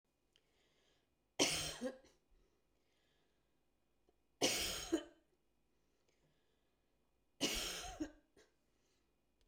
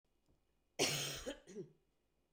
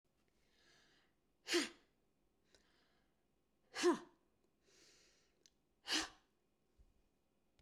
{"three_cough_length": "9.5 s", "three_cough_amplitude": 3594, "three_cough_signal_mean_std_ratio": 0.32, "cough_length": "2.3 s", "cough_amplitude": 2530, "cough_signal_mean_std_ratio": 0.4, "exhalation_length": "7.6 s", "exhalation_amplitude": 1992, "exhalation_signal_mean_std_ratio": 0.23, "survey_phase": "beta (2021-08-13 to 2022-03-07)", "age": "65+", "gender": "Female", "wearing_mask": "No", "symptom_none": true, "smoker_status": "Never smoked", "respiratory_condition_asthma": false, "respiratory_condition_other": false, "recruitment_source": "REACT", "submission_delay": "1 day", "covid_test_result": "Negative", "covid_test_method": "RT-qPCR"}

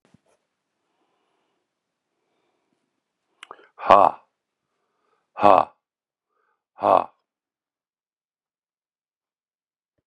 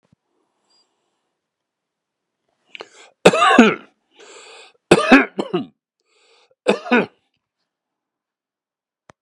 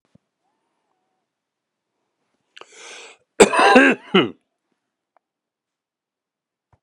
{"exhalation_length": "10.1 s", "exhalation_amplitude": 32768, "exhalation_signal_mean_std_ratio": 0.16, "three_cough_length": "9.2 s", "three_cough_amplitude": 32768, "three_cough_signal_mean_std_ratio": 0.26, "cough_length": "6.8 s", "cough_amplitude": 32768, "cough_signal_mean_std_ratio": 0.24, "survey_phase": "alpha (2021-03-01 to 2021-08-12)", "age": "65+", "gender": "Male", "wearing_mask": "No", "symptom_none": true, "smoker_status": "Ex-smoker", "respiratory_condition_asthma": true, "respiratory_condition_other": false, "recruitment_source": "REACT", "submission_delay": "1 day", "covid_test_result": "Negative", "covid_test_method": "RT-qPCR"}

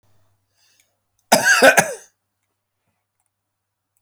{"cough_length": "4.0 s", "cough_amplitude": 30780, "cough_signal_mean_std_ratio": 0.28, "survey_phase": "beta (2021-08-13 to 2022-03-07)", "age": "45-64", "gender": "Male", "wearing_mask": "No", "symptom_none": true, "smoker_status": "Never smoked", "respiratory_condition_asthma": false, "respiratory_condition_other": false, "recruitment_source": "REACT", "submission_delay": "2 days", "covid_test_result": "Negative", "covid_test_method": "RT-qPCR", "influenza_a_test_result": "Negative", "influenza_b_test_result": "Negative"}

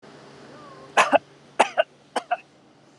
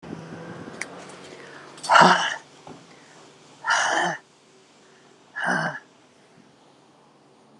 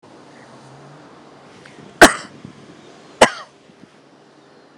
{"three_cough_length": "3.0 s", "three_cough_amplitude": 25818, "three_cough_signal_mean_std_ratio": 0.3, "exhalation_length": "7.6 s", "exhalation_amplitude": 29565, "exhalation_signal_mean_std_ratio": 0.36, "cough_length": "4.8 s", "cough_amplitude": 32768, "cough_signal_mean_std_ratio": 0.2, "survey_phase": "beta (2021-08-13 to 2022-03-07)", "age": "45-64", "gender": "Female", "wearing_mask": "Yes", "symptom_sore_throat": true, "symptom_fatigue": true, "symptom_headache": true, "symptom_onset": "12 days", "smoker_status": "Never smoked", "respiratory_condition_asthma": false, "respiratory_condition_other": false, "recruitment_source": "REACT", "submission_delay": "2 days", "covid_test_result": "Negative", "covid_test_method": "RT-qPCR"}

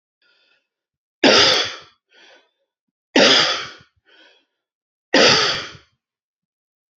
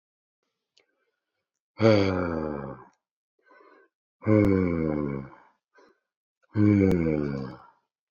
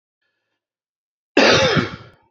{"three_cough_length": "7.0 s", "three_cough_amplitude": 30728, "three_cough_signal_mean_std_ratio": 0.36, "exhalation_length": "8.1 s", "exhalation_amplitude": 15319, "exhalation_signal_mean_std_ratio": 0.41, "cough_length": "2.3 s", "cough_amplitude": 30137, "cough_signal_mean_std_ratio": 0.39, "survey_phase": "beta (2021-08-13 to 2022-03-07)", "age": "45-64", "gender": "Male", "wearing_mask": "No", "symptom_cough_any": true, "symptom_abdominal_pain": true, "symptom_fatigue": true, "symptom_headache": true, "symptom_onset": "3 days", "smoker_status": "Never smoked", "respiratory_condition_asthma": false, "respiratory_condition_other": false, "recruitment_source": "Test and Trace", "submission_delay": "2 days", "covid_test_result": "Positive", "covid_test_method": "RT-qPCR", "covid_ct_value": 26.5, "covid_ct_gene": "ORF1ab gene", "covid_ct_mean": 26.8, "covid_viral_load": "1600 copies/ml", "covid_viral_load_category": "Minimal viral load (< 10K copies/ml)"}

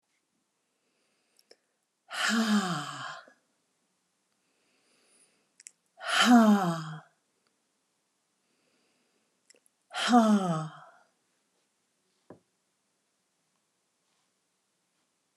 {"exhalation_length": "15.4 s", "exhalation_amplitude": 11822, "exhalation_signal_mean_std_ratio": 0.3, "survey_phase": "alpha (2021-03-01 to 2021-08-12)", "age": "65+", "gender": "Female", "wearing_mask": "No", "symptom_none": true, "smoker_status": "Never smoked", "respiratory_condition_asthma": false, "respiratory_condition_other": false, "recruitment_source": "REACT", "submission_delay": "1 day", "covid_test_result": "Negative", "covid_test_method": "RT-qPCR"}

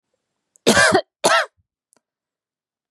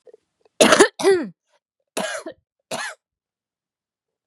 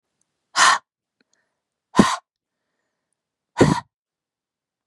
{"cough_length": "2.9 s", "cough_amplitude": 32768, "cough_signal_mean_std_ratio": 0.35, "three_cough_length": "4.3 s", "three_cough_amplitude": 32768, "three_cough_signal_mean_std_ratio": 0.32, "exhalation_length": "4.9 s", "exhalation_amplitude": 32767, "exhalation_signal_mean_std_ratio": 0.26, "survey_phase": "beta (2021-08-13 to 2022-03-07)", "age": "45-64", "gender": "Female", "wearing_mask": "No", "symptom_cough_any": true, "symptom_runny_or_blocked_nose": true, "symptom_shortness_of_breath": true, "symptom_sore_throat": true, "smoker_status": "Never smoked", "respiratory_condition_asthma": true, "respiratory_condition_other": false, "recruitment_source": "Test and Trace", "submission_delay": "1 day", "covid_test_result": "Positive", "covid_test_method": "LFT"}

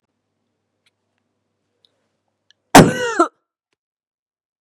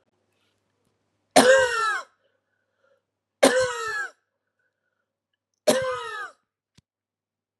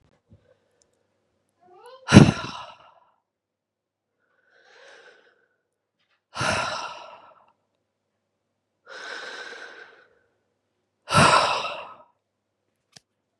{"cough_length": "4.6 s", "cough_amplitude": 32768, "cough_signal_mean_std_ratio": 0.2, "three_cough_length": "7.6 s", "three_cough_amplitude": 26445, "three_cough_signal_mean_std_ratio": 0.34, "exhalation_length": "13.4 s", "exhalation_amplitude": 32768, "exhalation_signal_mean_std_ratio": 0.22, "survey_phase": "beta (2021-08-13 to 2022-03-07)", "age": "18-44", "gender": "Female", "wearing_mask": "No", "symptom_cough_any": true, "symptom_runny_or_blocked_nose": true, "symptom_shortness_of_breath": true, "symptom_sore_throat": true, "symptom_diarrhoea": true, "symptom_fatigue": true, "symptom_headache": true, "symptom_change_to_sense_of_smell_or_taste": true, "symptom_loss_of_taste": true, "smoker_status": "Ex-smoker", "respiratory_condition_asthma": false, "respiratory_condition_other": false, "recruitment_source": "Test and Trace", "submission_delay": "2 days", "covid_test_result": "Positive", "covid_test_method": "LFT"}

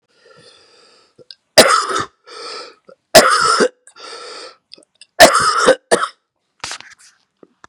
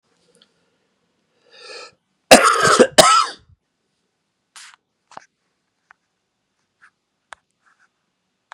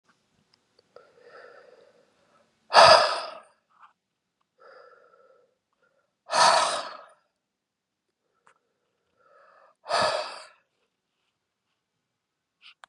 {"three_cough_length": "7.7 s", "three_cough_amplitude": 32768, "three_cough_signal_mean_std_ratio": 0.37, "cough_length": "8.5 s", "cough_amplitude": 32768, "cough_signal_mean_std_ratio": 0.24, "exhalation_length": "12.9 s", "exhalation_amplitude": 29783, "exhalation_signal_mean_std_ratio": 0.23, "survey_phase": "beta (2021-08-13 to 2022-03-07)", "age": "45-64", "gender": "Male", "wearing_mask": "No", "symptom_cough_any": true, "symptom_runny_or_blocked_nose": true, "symptom_sore_throat": true, "symptom_fatigue": true, "symptom_fever_high_temperature": true, "symptom_headache": true, "symptom_change_to_sense_of_smell_or_taste": true, "symptom_loss_of_taste": true, "symptom_onset": "3 days", "smoker_status": "Ex-smoker", "respiratory_condition_asthma": false, "respiratory_condition_other": false, "recruitment_source": "Test and Trace", "submission_delay": "1 day", "covid_test_result": "Positive", "covid_test_method": "RT-qPCR", "covid_ct_value": 28.3, "covid_ct_gene": "N gene"}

